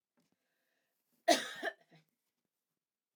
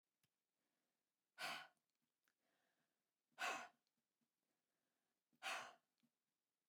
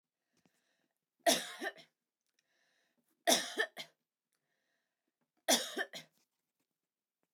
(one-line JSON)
{"cough_length": "3.2 s", "cough_amplitude": 6730, "cough_signal_mean_std_ratio": 0.2, "exhalation_length": "6.7 s", "exhalation_amplitude": 601, "exhalation_signal_mean_std_ratio": 0.27, "three_cough_length": "7.3 s", "three_cough_amplitude": 6986, "three_cough_signal_mean_std_ratio": 0.26, "survey_phase": "alpha (2021-03-01 to 2021-08-12)", "age": "45-64", "gender": "Female", "wearing_mask": "No", "symptom_none": true, "smoker_status": "Never smoked", "respiratory_condition_asthma": false, "respiratory_condition_other": false, "recruitment_source": "REACT", "submission_delay": "2 days", "covid_test_result": "Negative", "covid_test_method": "RT-qPCR"}